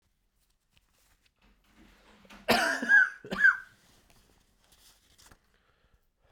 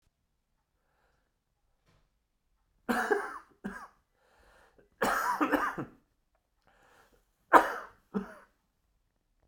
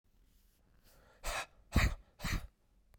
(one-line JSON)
{"cough_length": "6.3 s", "cough_amplitude": 9645, "cough_signal_mean_std_ratio": 0.28, "three_cough_length": "9.5 s", "three_cough_amplitude": 28332, "three_cough_signal_mean_std_ratio": 0.28, "exhalation_length": "3.0 s", "exhalation_amplitude": 5114, "exhalation_signal_mean_std_ratio": 0.35, "survey_phase": "beta (2021-08-13 to 2022-03-07)", "age": "45-64", "gender": "Male", "wearing_mask": "Yes", "symptom_new_continuous_cough": true, "symptom_runny_or_blocked_nose": true, "symptom_sore_throat": true, "symptom_fatigue": true, "symptom_headache": true, "symptom_onset": "3 days", "smoker_status": "Ex-smoker", "respiratory_condition_asthma": false, "respiratory_condition_other": false, "recruitment_source": "Test and Trace", "submission_delay": "1 day", "covid_test_result": "Positive", "covid_test_method": "RT-qPCR", "covid_ct_value": 19.6, "covid_ct_gene": "ORF1ab gene"}